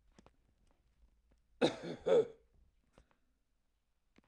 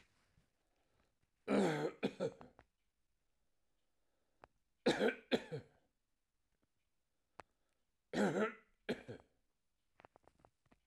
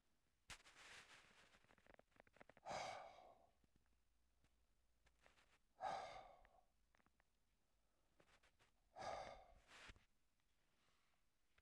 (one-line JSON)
{"cough_length": "4.3 s", "cough_amplitude": 5679, "cough_signal_mean_std_ratio": 0.25, "three_cough_length": "10.9 s", "three_cough_amplitude": 2890, "three_cough_signal_mean_std_ratio": 0.3, "exhalation_length": "11.6 s", "exhalation_amplitude": 520, "exhalation_signal_mean_std_ratio": 0.41, "survey_phase": "beta (2021-08-13 to 2022-03-07)", "age": "65+", "gender": "Male", "wearing_mask": "No", "symptom_cough_any": true, "symptom_runny_or_blocked_nose": true, "symptom_onset": "13 days", "smoker_status": "Ex-smoker", "respiratory_condition_asthma": false, "respiratory_condition_other": false, "recruitment_source": "REACT", "submission_delay": "1 day", "covid_test_result": "Negative", "covid_test_method": "RT-qPCR"}